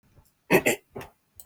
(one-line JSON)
{"cough_length": "1.5 s", "cough_amplitude": 18803, "cough_signal_mean_std_ratio": 0.31, "survey_phase": "beta (2021-08-13 to 2022-03-07)", "age": "18-44", "gender": "Male", "wearing_mask": "Prefer not to say", "symptom_none": true, "smoker_status": "Never smoked", "respiratory_condition_asthma": false, "respiratory_condition_other": false, "recruitment_source": "REACT", "submission_delay": "5 days", "covid_test_result": "Negative", "covid_test_method": "RT-qPCR", "influenza_a_test_result": "Negative", "influenza_b_test_result": "Negative"}